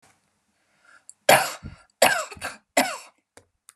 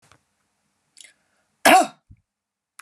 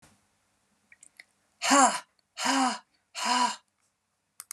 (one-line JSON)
{"three_cough_length": "3.8 s", "three_cough_amplitude": 29004, "three_cough_signal_mean_std_ratio": 0.3, "cough_length": "2.8 s", "cough_amplitude": 29784, "cough_signal_mean_std_ratio": 0.22, "exhalation_length": "4.5 s", "exhalation_amplitude": 15396, "exhalation_signal_mean_std_ratio": 0.38, "survey_phase": "beta (2021-08-13 to 2022-03-07)", "age": "45-64", "gender": "Female", "wearing_mask": "No", "symptom_none": true, "smoker_status": "Never smoked", "respiratory_condition_asthma": false, "respiratory_condition_other": false, "recruitment_source": "REACT", "submission_delay": "1 day", "covid_test_result": "Negative", "covid_test_method": "RT-qPCR", "influenza_a_test_result": "Negative", "influenza_b_test_result": "Negative"}